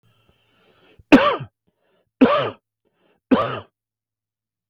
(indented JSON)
{
  "three_cough_length": "4.7 s",
  "three_cough_amplitude": 32768,
  "three_cough_signal_mean_std_ratio": 0.29,
  "survey_phase": "beta (2021-08-13 to 2022-03-07)",
  "age": "45-64",
  "gender": "Male",
  "wearing_mask": "No",
  "symptom_none": true,
  "smoker_status": "Ex-smoker",
  "respiratory_condition_asthma": false,
  "respiratory_condition_other": false,
  "recruitment_source": "REACT",
  "submission_delay": "3 days",
  "covid_test_result": "Negative",
  "covid_test_method": "RT-qPCR",
  "influenza_a_test_result": "Negative",
  "influenza_b_test_result": "Negative"
}